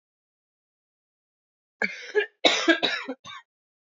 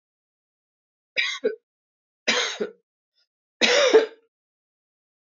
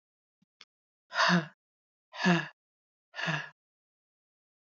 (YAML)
cough_length: 3.8 s
cough_amplitude: 20859
cough_signal_mean_std_ratio: 0.33
three_cough_length: 5.2 s
three_cough_amplitude: 23854
three_cough_signal_mean_std_ratio: 0.33
exhalation_length: 4.6 s
exhalation_amplitude: 7667
exhalation_signal_mean_std_ratio: 0.32
survey_phase: alpha (2021-03-01 to 2021-08-12)
age: 18-44
gender: Female
wearing_mask: 'No'
symptom_cough_any: true
symptom_shortness_of_breath: true
symptom_change_to_sense_of_smell_or_taste: true
symptom_loss_of_taste: true
smoker_status: Never smoked
respiratory_condition_asthma: false
respiratory_condition_other: false
recruitment_source: Test and Trace
submission_delay: 2 days
covid_test_result: Positive
covid_test_method: RT-qPCR